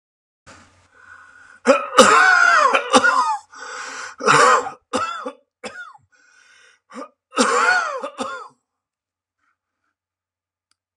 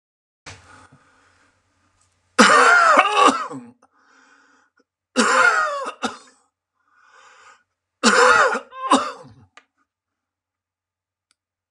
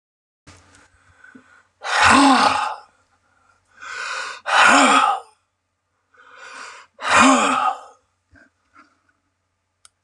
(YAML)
cough_length: 11.0 s
cough_amplitude: 32768
cough_signal_mean_std_ratio: 0.44
three_cough_length: 11.7 s
three_cough_amplitude: 32767
three_cough_signal_mean_std_ratio: 0.38
exhalation_length: 10.0 s
exhalation_amplitude: 32745
exhalation_signal_mean_std_ratio: 0.41
survey_phase: alpha (2021-03-01 to 2021-08-12)
age: 65+
gender: Male
wearing_mask: 'No'
symptom_none: true
smoker_status: Never smoked
respiratory_condition_asthma: false
respiratory_condition_other: false
recruitment_source: REACT
submission_delay: 1 day
covid_test_result: Negative
covid_test_method: RT-qPCR